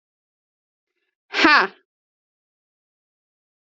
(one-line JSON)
{"exhalation_length": "3.8 s", "exhalation_amplitude": 31748, "exhalation_signal_mean_std_ratio": 0.21, "survey_phase": "alpha (2021-03-01 to 2021-08-12)", "age": "18-44", "gender": "Female", "wearing_mask": "No", "symptom_headache": true, "smoker_status": "Never smoked", "respiratory_condition_asthma": false, "respiratory_condition_other": false, "recruitment_source": "Test and Trace", "submission_delay": "2 days", "covid_test_result": "Positive", "covid_test_method": "RT-qPCR"}